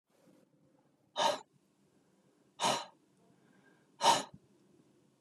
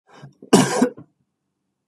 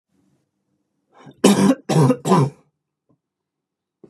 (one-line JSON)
{"exhalation_length": "5.2 s", "exhalation_amplitude": 6454, "exhalation_signal_mean_std_ratio": 0.28, "cough_length": "1.9 s", "cough_amplitude": 32318, "cough_signal_mean_std_ratio": 0.33, "three_cough_length": "4.1 s", "three_cough_amplitude": 32479, "three_cough_signal_mean_std_ratio": 0.37, "survey_phase": "beta (2021-08-13 to 2022-03-07)", "age": "18-44", "gender": "Male", "wearing_mask": "No", "symptom_cough_any": true, "symptom_new_continuous_cough": true, "symptom_runny_or_blocked_nose": true, "symptom_shortness_of_breath": true, "symptom_sore_throat": true, "symptom_abdominal_pain": true, "symptom_headache": true, "smoker_status": "Never smoked", "respiratory_condition_asthma": false, "respiratory_condition_other": false, "recruitment_source": "Test and Trace", "submission_delay": "1 day", "covid_test_result": "Positive", "covid_test_method": "LFT"}